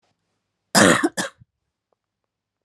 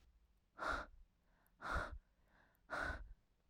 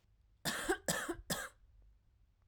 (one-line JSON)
{"cough_length": "2.6 s", "cough_amplitude": 32762, "cough_signal_mean_std_ratio": 0.29, "exhalation_length": "3.5 s", "exhalation_amplitude": 1171, "exhalation_signal_mean_std_ratio": 0.47, "three_cough_length": "2.5 s", "three_cough_amplitude": 3324, "three_cough_signal_mean_std_ratio": 0.47, "survey_phase": "alpha (2021-03-01 to 2021-08-12)", "age": "18-44", "gender": "Female", "wearing_mask": "No", "symptom_cough_any": true, "symptom_headache": true, "symptom_onset": "2 days", "smoker_status": "Current smoker (e-cigarettes or vapes only)", "respiratory_condition_asthma": false, "respiratory_condition_other": false, "recruitment_source": "Test and Trace", "submission_delay": "1 day", "covid_test_result": "Positive", "covid_test_method": "RT-qPCR", "covid_ct_value": 25.1, "covid_ct_gene": "S gene", "covid_ct_mean": 25.6, "covid_viral_load": "3900 copies/ml", "covid_viral_load_category": "Minimal viral load (< 10K copies/ml)"}